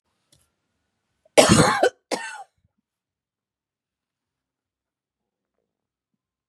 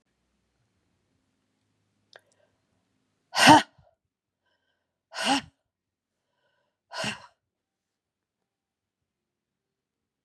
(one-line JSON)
{"cough_length": "6.5 s", "cough_amplitude": 32766, "cough_signal_mean_std_ratio": 0.22, "exhalation_length": "10.2 s", "exhalation_amplitude": 30258, "exhalation_signal_mean_std_ratio": 0.16, "survey_phase": "beta (2021-08-13 to 2022-03-07)", "age": "45-64", "gender": "Female", "wearing_mask": "No", "symptom_cough_any": true, "symptom_change_to_sense_of_smell_or_taste": true, "symptom_loss_of_taste": true, "symptom_onset": "6 days", "smoker_status": "Never smoked", "respiratory_condition_asthma": false, "respiratory_condition_other": false, "recruitment_source": "Test and Trace", "submission_delay": "3 days", "covid_test_result": "Positive", "covid_test_method": "RT-qPCR", "covid_ct_value": 20.2, "covid_ct_gene": "ORF1ab gene"}